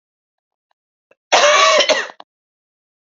{"cough_length": "3.2 s", "cough_amplitude": 31219, "cough_signal_mean_std_ratio": 0.39, "survey_phase": "beta (2021-08-13 to 2022-03-07)", "age": "45-64", "gender": "Female", "wearing_mask": "No", "symptom_cough_any": true, "symptom_runny_or_blocked_nose": true, "symptom_sore_throat": true, "symptom_fatigue": true, "symptom_fever_high_temperature": true, "symptom_headache": true, "symptom_onset": "2 days", "smoker_status": "Never smoked", "respiratory_condition_asthma": false, "respiratory_condition_other": false, "recruitment_source": "Test and Trace", "submission_delay": "1 day", "covid_test_result": "Positive", "covid_test_method": "RT-qPCR", "covid_ct_value": 19.9, "covid_ct_gene": "ORF1ab gene", "covid_ct_mean": 20.4, "covid_viral_load": "200000 copies/ml", "covid_viral_load_category": "Low viral load (10K-1M copies/ml)"}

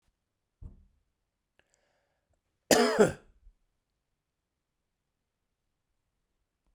{"cough_length": "6.7 s", "cough_amplitude": 13263, "cough_signal_mean_std_ratio": 0.19, "survey_phase": "beta (2021-08-13 to 2022-03-07)", "age": "45-64", "gender": "Male", "wearing_mask": "No", "symptom_cough_any": true, "symptom_runny_or_blocked_nose": true, "symptom_shortness_of_breath": true, "symptom_sore_throat": true, "symptom_abdominal_pain": true, "symptom_fatigue": true, "symptom_headache": true, "symptom_other": true, "symptom_onset": "5 days", "smoker_status": "Never smoked", "respiratory_condition_asthma": false, "respiratory_condition_other": false, "recruitment_source": "Test and Trace", "submission_delay": "2 days", "covid_test_result": "Positive", "covid_test_method": "RT-qPCR", "covid_ct_value": 26.7, "covid_ct_gene": "ORF1ab gene", "covid_ct_mean": 27.7, "covid_viral_load": "830 copies/ml", "covid_viral_load_category": "Minimal viral load (< 10K copies/ml)"}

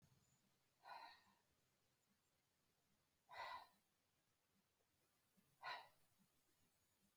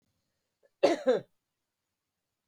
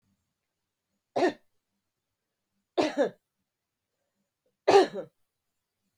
{"exhalation_length": "7.2 s", "exhalation_amplitude": 302, "exhalation_signal_mean_std_ratio": 0.35, "cough_length": "2.5 s", "cough_amplitude": 10284, "cough_signal_mean_std_ratio": 0.26, "three_cough_length": "6.0 s", "three_cough_amplitude": 15246, "three_cough_signal_mean_std_ratio": 0.24, "survey_phase": "beta (2021-08-13 to 2022-03-07)", "age": "45-64", "gender": "Female", "wearing_mask": "No", "symptom_runny_or_blocked_nose": true, "symptom_other": true, "symptom_onset": "5 days", "smoker_status": "Never smoked", "respiratory_condition_asthma": false, "respiratory_condition_other": false, "recruitment_source": "REACT", "submission_delay": "2 days", "covid_test_result": "Negative", "covid_test_method": "RT-qPCR", "influenza_a_test_result": "Negative", "influenza_b_test_result": "Negative"}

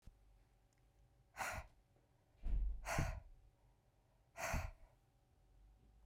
{"exhalation_length": "6.1 s", "exhalation_amplitude": 1847, "exhalation_signal_mean_std_ratio": 0.42, "survey_phase": "beta (2021-08-13 to 2022-03-07)", "age": "45-64", "gender": "Female", "wearing_mask": "No", "symptom_none": true, "symptom_onset": "7 days", "smoker_status": "Ex-smoker", "respiratory_condition_asthma": false, "respiratory_condition_other": false, "recruitment_source": "REACT", "submission_delay": "2 days", "covid_test_result": "Negative", "covid_test_method": "RT-qPCR", "influenza_a_test_result": "Negative", "influenza_b_test_result": "Negative"}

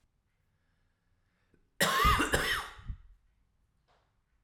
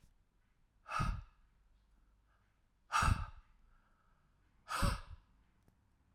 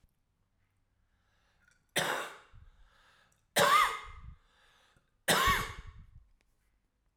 {"cough_length": "4.4 s", "cough_amplitude": 8188, "cough_signal_mean_std_ratio": 0.36, "exhalation_length": "6.1 s", "exhalation_amplitude": 3218, "exhalation_signal_mean_std_ratio": 0.33, "three_cough_length": "7.2 s", "three_cough_amplitude": 8110, "three_cough_signal_mean_std_ratio": 0.33, "survey_phase": "alpha (2021-03-01 to 2021-08-12)", "age": "18-44", "gender": "Male", "wearing_mask": "No", "symptom_cough_any": true, "symptom_new_continuous_cough": true, "symptom_fatigue": true, "symptom_headache": true, "symptom_change_to_sense_of_smell_or_taste": true, "symptom_loss_of_taste": true, "symptom_onset": "4 days", "smoker_status": "Ex-smoker", "respiratory_condition_asthma": false, "respiratory_condition_other": false, "recruitment_source": "Test and Trace", "submission_delay": "1 day", "covid_test_result": "Positive", "covid_test_method": "RT-qPCR", "covid_ct_value": 12.7, "covid_ct_gene": "ORF1ab gene", "covid_ct_mean": 13.2, "covid_viral_load": "48000000 copies/ml", "covid_viral_load_category": "High viral load (>1M copies/ml)"}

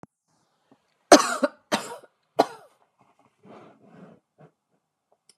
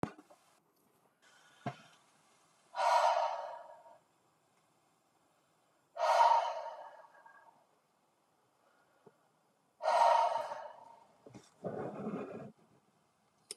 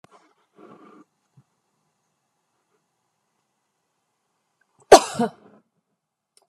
{"three_cough_length": "5.4 s", "three_cough_amplitude": 32768, "three_cough_signal_mean_std_ratio": 0.19, "exhalation_length": "13.6 s", "exhalation_amplitude": 5475, "exhalation_signal_mean_std_ratio": 0.36, "cough_length": "6.5 s", "cough_amplitude": 32768, "cough_signal_mean_std_ratio": 0.12, "survey_phase": "beta (2021-08-13 to 2022-03-07)", "age": "45-64", "gender": "Female", "wearing_mask": "No", "symptom_none": true, "smoker_status": "Never smoked", "respiratory_condition_asthma": false, "respiratory_condition_other": false, "recruitment_source": "REACT", "submission_delay": "1 day", "covid_test_result": "Negative", "covid_test_method": "RT-qPCR", "influenza_a_test_result": "Unknown/Void", "influenza_b_test_result": "Unknown/Void"}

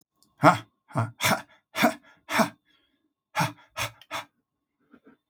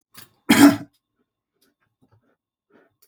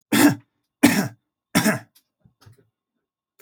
{"exhalation_length": "5.3 s", "exhalation_amplitude": 29196, "exhalation_signal_mean_std_ratio": 0.33, "cough_length": "3.1 s", "cough_amplitude": 28159, "cough_signal_mean_std_ratio": 0.23, "three_cough_length": "3.4 s", "three_cough_amplitude": 28661, "three_cough_signal_mean_std_ratio": 0.35, "survey_phase": "alpha (2021-03-01 to 2021-08-12)", "age": "65+", "gender": "Male", "wearing_mask": "No", "symptom_none": true, "smoker_status": "Never smoked", "respiratory_condition_asthma": false, "respiratory_condition_other": false, "recruitment_source": "REACT", "submission_delay": "1 day", "covid_test_result": "Negative", "covid_test_method": "RT-qPCR"}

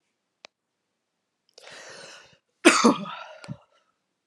{"cough_length": "4.3 s", "cough_amplitude": 30642, "cough_signal_mean_std_ratio": 0.24, "survey_phase": "beta (2021-08-13 to 2022-03-07)", "age": "45-64", "gender": "Female", "wearing_mask": "No", "symptom_cough_any": true, "symptom_runny_or_blocked_nose": true, "symptom_shortness_of_breath": true, "symptom_fatigue": true, "symptom_onset": "6 days", "smoker_status": "Never smoked", "respiratory_condition_asthma": false, "respiratory_condition_other": false, "recruitment_source": "Test and Trace", "submission_delay": "2 days", "covid_test_result": "Positive", "covid_test_method": "RT-qPCR"}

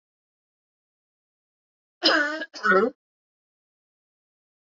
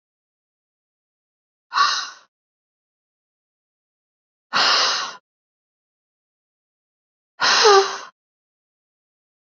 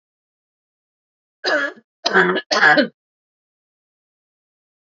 {"cough_length": "4.7 s", "cough_amplitude": 15338, "cough_signal_mean_std_ratio": 0.29, "exhalation_length": "9.6 s", "exhalation_amplitude": 27640, "exhalation_signal_mean_std_ratio": 0.29, "three_cough_length": "4.9 s", "three_cough_amplitude": 29140, "three_cough_signal_mean_std_ratio": 0.33, "survey_phase": "alpha (2021-03-01 to 2021-08-12)", "age": "45-64", "gender": "Female", "wearing_mask": "No", "symptom_none": true, "smoker_status": "Ex-smoker", "respiratory_condition_asthma": true, "respiratory_condition_other": false, "recruitment_source": "REACT", "submission_delay": "7 days", "covid_test_result": "Negative", "covid_test_method": "RT-qPCR"}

